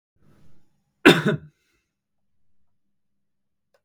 {"cough_length": "3.8 s", "cough_amplitude": 32768, "cough_signal_mean_std_ratio": 0.2, "survey_phase": "beta (2021-08-13 to 2022-03-07)", "age": "18-44", "gender": "Male", "wearing_mask": "No", "symptom_prefer_not_to_say": true, "smoker_status": "Never smoked", "respiratory_condition_asthma": false, "respiratory_condition_other": false, "recruitment_source": "REACT", "submission_delay": "2 days", "covid_test_result": "Negative", "covid_test_method": "RT-qPCR"}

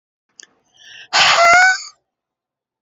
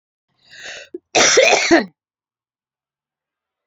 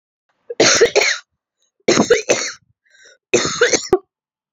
{"exhalation_length": "2.8 s", "exhalation_amplitude": 31626, "exhalation_signal_mean_std_ratio": 0.43, "cough_length": "3.7 s", "cough_amplitude": 31571, "cough_signal_mean_std_ratio": 0.36, "three_cough_length": "4.5 s", "three_cough_amplitude": 32767, "three_cough_signal_mean_std_ratio": 0.46, "survey_phase": "alpha (2021-03-01 to 2021-08-12)", "age": "45-64", "gender": "Female", "wearing_mask": "No", "symptom_headache": true, "symptom_onset": "3 days", "smoker_status": "Ex-smoker", "respiratory_condition_asthma": false, "respiratory_condition_other": false, "recruitment_source": "Test and Trace", "submission_delay": "2 days", "covid_test_result": "Positive", "covid_test_method": "RT-qPCR", "covid_ct_value": 34.3, "covid_ct_gene": "N gene", "covid_ct_mean": 34.8, "covid_viral_load": "3.9 copies/ml", "covid_viral_load_category": "Minimal viral load (< 10K copies/ml)"}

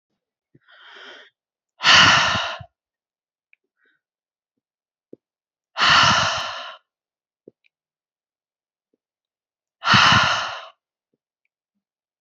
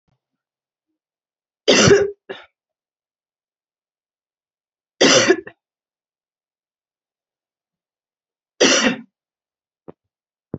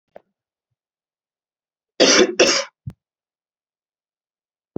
{"exhalation_length": "12.2 s", "exhalation_amplitude": 30800, "exhalation_signal_mean_std_ratio": 0.32, "three_cough_length": "10.6 s", "three_cough_amplitude": 27926, "three_cough_signal_mean_std_ratio": 0.26, "cough_length": "4.8 s", "cough_amplitude": 30872, "cough_signal_mean_std_ratio": 0.27, "survey_phase": "beta (2021-08-13 to 2022-03-07)", "age": "18-44", "gender": "Female", "wearing_mask": "No", "symptom_none": true, "symptom_onset": "4 days", "smoker_status": "Current smoker (1 to 10 cigarettes per day)", "respiratory_condition_asthma": false, "respiratory_condition_other": false, "recruitment_source": "REACT", "submission_delay": "1 day", "covid_test_result": "Positive", "covid_test_method": "RT-qPCR", "covid_ct_value": 23.0, "covid_ct_gene": "E gene", "influenza_a_test_result": "Negative", "influenza_b_test_result": "Negative"}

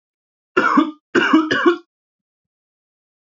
{"three_cough_length": "3.3 s", "three_cough_amplitude": 27370, "three_cough_signal_mean_std_ratio": 0.42, "survey_phase": "beta (2021-08-13 to 2022-03-07)", "age": "18-44", "gender": "Male", "wearing_mask": "No", "symptom_none": true, "smoker_status": "Ex-smoker", "respiratory_condition_asthma": false, "respiratory_condition_other": false, "recruitment_source": "REACT", "submission_delay": "0 days", "covid_test_result": "Negative", "covid_test_method": "RT-qPCR", "influenza_a_test_result": "Negative", "influenza_b_test_result": "Negative"}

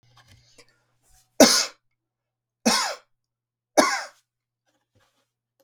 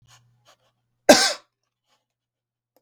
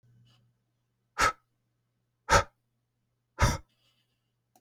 {"three_cough_length": "5.6 s", "three_cough_amplitude": 32767, "three_cough_signal_mean_std_ratio": 0.25, "cough_length": "2.8 s", "cough_amplitude": 32766, "cough_signal_mean_std_ratio": 0.2, "exhalation_length": "4.6 s", "exhalation_amplitude": 11836, "exhalation_signal_mean_std_ratio": 0.24, "survey_phase": "beta (2021-08-13 to 2022-03-07)", "age": "45-64", "gender": "Male", "wearing_mask": "No", "symptom_none": true, "smoker_status": "Never smoked", "respiratory_condition_asthma": false, "respiratory_condition_other": false, "recruitment_source": "REACT", "submission_delay": "2 days", "covid_test_result": "Negative", "covid_test_method": "RT-qPCR", "influenza_a_test_result": "Negative", "influenza_b_test_result": "Negative"}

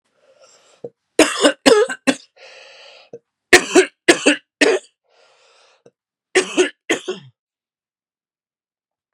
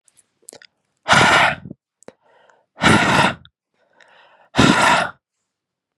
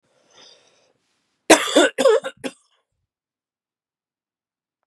{"three_cough_length": "9.1 s", "three_cough_amplitude": 32768, "three_cough_signal_mean_std_ratio": 0.32, "exhalation_length": "6.0 s", "exhalation_amplitude": 32736, "exhalation_signal_mean_std_ratio": 0.42, "cough_length": "4.9 s", "cough_amplitude": 32768, "cough_signal_mean_std_ratio": 0.26, "survey_phase": "beta (2021-08-13 to 2022-03-07)", "age": "18-44", "gender": "Male", "wearing_mask": "No", "symptom_runny_or_blocked_nose": true, "symptom_fatigue": true, "smoker_status": "Never smoked", "respiratory_condition_asthma": true, "respiratory_condition_other": false, "recruitment_source": "REACT", "submission_delay": "2 days", "covid_test_result": "Negative", "covid_test_method": "RT-qPCR", "influenza_a_test_result": "Negative", "influenza_b_test_result": "Negative"}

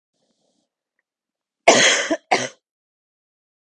{"cough_length": "3.8 s", "cough_amplitude": 32768, "cough_signal_mean_std_ratio": 0.29, "survey_phase": "beta (2021-08-13 to 2022-03-07)", "age": "18-44", "gender": "Female", "wearing_mask": "No", "symptom_runny_or_blocked_nose": true, "symptom_sore_throat": true, "symptom_headache": true, "symptom_onset": "2 days", "smoker_status": "Never smoked", "respiratory_condition_asthma": false, "respiratory_condition_other": false, "recruitment_source": "Test and Trace", "submission_delay": "2 days", "covid_test_result": "Positive", "covid_test_method": "RT-qPCR", "covid_ct_value": 21.3, "covid_ct_gene": "N gene", "covid_ct_mean": 21.9, "covid_viral_load": "64000 copies/ml", "covid_viral_load_category": "Low viral load (10K-1M copies/ml)"}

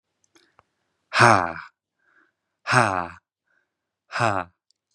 {"exhalation_length": "4.9 s", "exhalation_amplitude": 32537, "exhalation_signal_mean_std_ratio": 0.29, "survey_phase": "beta (2021-08-13 to 2022-03-07)", "age": "18-44", "gender": "Male", "wearing_mask": "No", "symptom_none": true, "smoker_status": "Never smoked", "respiratory_condition_asthma": false, "respiratory_condition_other": false, "recruitment_source": "REACT", "submission_delay": "2 days", "covid_test_result": "Negative", "covid_test_method": "RT-qPCR", "covid_ct_value": 37.0, "covid_ct_gene": "N gene", "influenza_a_test_result": "Negative", "influenza_b_test_result": "Negative"}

